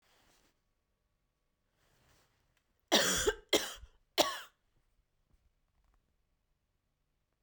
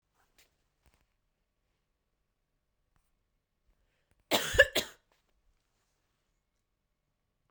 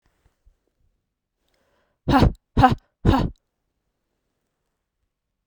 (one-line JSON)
{"three_cough_length": "7.4 s", "three_cough_amplitude": 7961, "three_cough_signal_mean_std_ratio": 0.24, "cough_length": "7.5 s", "cough_amplitude": 19533, "cough_signal_mean_std_ratio": 0.15, "exhalation_length": "5.5 s", "exhalation_amplitude": 28548, "exhalation_signal_mean_std_ratio": 0.27, "survey_phase": "beta (2021-08-13 to 2022-03-07)", "age": "18-44", "gender": "Female", "wearing_mask": "No", "symptom_cough_any": true, "symptom_runny_or_blocked_nose": true, "symptom_shortness_of_breath": true, "symptom_sore_throat": true, "symptom_fatigue": true, "symptom_headache": true, "symptom_change_to_sense_of_smell_or_taste": true, "symptom_onset": "6 days", "smoker_status": "Never smoked", "respiratory_condition_asthma": false, "respiratory_condition_other": false, "recruitment_source": "Test and Trace", "submission_delay": "2 days", "covid_test_result": "Positive", "covid_test_method": "RT-qPCR", "covid_ct_value": 23.4, "covid_ct_gene": "ORF1ab gene"}